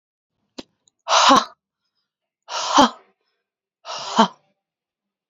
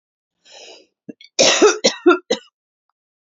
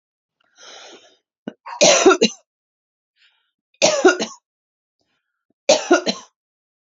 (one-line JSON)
{"exhalation_length": "5.3 s", "exhalation_amplitude": 29653, "exhalation_signal_mean_std_ratio": 0.31, "cough_length": "3.2 s", "cough_amplitude": 32768, "cough_signal_mean_std_ratio": 0.35, "three_cough_length": "7.0 s", "three_cough_amplitude": 32767, "three_cough_signal_mean_std_ratio": 0.31, "survey_phase": "beta (2021-08-13 to 2022-03-07)", "age": "18-44", "gender": "Female", "wearing_mask": "No", "symptom_cough_any": true, "symptom_onset": "12 days", "smoker_status": "Current smoker (11 or more cigarettes per day)", "respiratory_condition_asthma": true, "respiratory_condition_other": false, "recruitment_source": "REACT", "submission_delay": "1 day", "covid_test_result": "Negative", "covid_test_method": "RT-qPCR"}